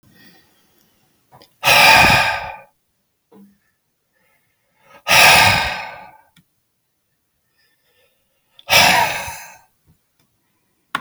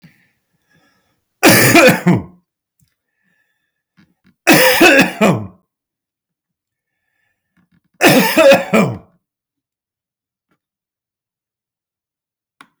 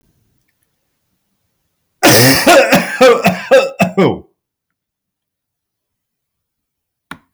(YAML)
exhalation_length: 11.0 s
exhalation_amplitude: 32768
exhalation_signal_mean_std_ratio: 0.35
three_cough_length: 12.8 s
three_cough_amplitude: 32768
three_cough_signal_mean_std_ratio: 0.36
cough_length: 7.3 s
cough_amplitude: 32768
cough_signal_mean_std_ratio: 0.41
survey_phase: beta (2021-08-13 to 2022-03-07)
age: 65+
gender: Male
wearing_mask: 'No'
symptom_none: true
symptom_onset: 12 days
smoker_status: Never smoked
respiratory_condition_asthma: false
respiratory_condition_other: false
recruitment_source: REACT
submission_delay: 2 days
covid_test_result: Negative
covid_test_method: RT-qPCR